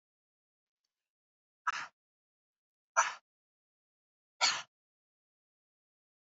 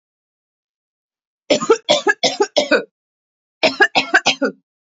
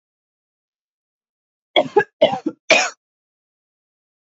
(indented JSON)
{
  "exhalation_length": "6.4 s",
  "exhalation_amplitude": 5923,
  "exhalation_signal_mean_std_ratio": 0.19,
  "cough_length": "4.9 s",
  "cough_amplitude": 31320,
  "cough_signal_mean_std_ratio": 0.39,
  "three_cough_length": "4.3 s",
  "three_cough_amplitude": 29670,
  "three_cough_signal_mean_std_ratio": 0.26,
  "survey_phase": "alpha (2021-03-01 to 2021-08-12)",
  "age": "18-44",
  "gender": "Female",
  "wearing_mask": "No",
  "symptom_none": true,
  "smoker_status": "Never smoked",
  "respiratory_condition_asthma": false,
  "respiratory_condition_other": false,
  "recruitment_source": "REACT",
  "submission_delay": "3 days",
  "covid_test_result": "Negative",
  "covid_test_method": "RT-qPCR"
}